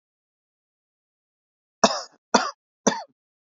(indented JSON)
{
  "three_cough_length": "3.5 s",
  "three_cough_amplitude": 32767,
  "three_cough_signal_mean_std_ratio": 0.21,
  "survey_phase": "beta (2021-08-13 to 2022-03-07)",
  "age": "18-44",
  "gender": "Male",
  "wearing_mask": "No",
  "symptom_none": true,
  "smoker_status": "Never smoked",
  "respiratory_condition_asthma": false,
  "respiratory_condition_other": false,
  "recruitment_source": "REACT",
  "submission_delay": "1 day",
  "covid_test_result": "Negative",
  "covid_test_method": "RT-qPCR",
  "influenza_a_test_result": "Negative",
  "influenza_b_test_result": "Negative"
}